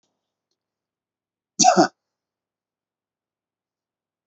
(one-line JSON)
{"cough_length": "4.3 s", "cough_amplitude": 27425, "cough_signal_mean_std_ratio": 0.19, "survey_phase": "beta (2021-08-13 to 2022-03-07)", "age": "45-64", "gender": "Male", "wearing_mask": "No", "symptom_none": true, "smoker_status": "Never smoked", "respiratory_condition_asthma": false, "respiratory_condition_other": false, "recruitment_source": "REACT", "submission_delay": "1 day", "covid_test_result": "Negative", "covid_test_method": "RT-qPCR", "influenza_a_test_result": "Negative", "influenza_b_test_result": "Negative"}